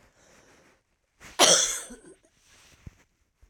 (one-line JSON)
{"three_cough_length": "3.5 s", "three_cough_amplitude": 20832, "three_cough_signal_mean_std_ratio": 0.27, "survey_phase": "alpha (2021-03-01 to 2021-08-12)", "age": "65+", "gender": "Female", "wearing_mask": "No", "symptom_cough_any": true, "symptom_new_continuous_cough": true, "symptom_fatigue": true, "symptom_headache": true, "smoker_status": "Never smoked", "respiratory_condition_asthma": true, "respiratory_condition_other": false, "recruitment_source": "Test and Trace", "submission_delay": "2 days", "covid_test_result": "Positive", "covid_test_method": "RT-qPCR"}